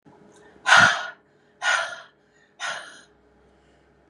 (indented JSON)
{
  "exhalation_length": "4.1 s",
  "exhalation_amplitude": 27769,
  "exhalation_signal_mean_std_ratio": 0.32,
  "survey_phase": "beta (2021-08-13 to 2022-03-07)",
  "age": "18-44",
  "gender": "Female",
  "wearing_mask": "No",
  "symptom_none": true,
  "smoker_status": "Never smoked",
  "respiratory_condition_asthma": false,
  "respiratory_condition_other": false,
  "recruitment_source": "REACT",
  "submission_delay": "0 days",
  "covid_test_result": "Negative",
  "covid_test_method": "RT-qPCR",
  "influenza_a_test_result": "Negative",
  "influenza_b_test_result": "Negative"
}